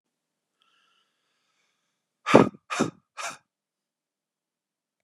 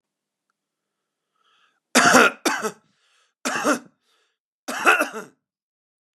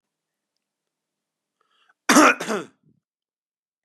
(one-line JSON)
{"exhalation_length": "5.0 s", "exhalation_amplitude": 32767, "exhalation_signal_mean_std_ratio": 0.18, "three_cough_length": "6.1 s", "three_cough_amplitude": 32767, "three_cough_signal_mean_std_ratio": 0.32, "cough_length": "3.8 s", "cough_amplitude": 31466, "cough_signal_mean_std_ratio": 0.23, "survey_phase": "beta (2021-08-13 to 2022-03-07)", "age": "18-44", "gender": "Male", "wearing_mask": "No", "symptom_none": true, "symptom_onset": "9 days", "smoker_status": "Ex-smoker", "respiratory_condition_asthma": false, "respiratory_condition_other": false, "recruitment_source": "REACT", "submission_delay": "1 day", "covid_test_result": "Negative", "covid_test_method": "RT-qPCR", "influenza_a_test_result": "Negative", "influenza_b_test_result": "Negative"}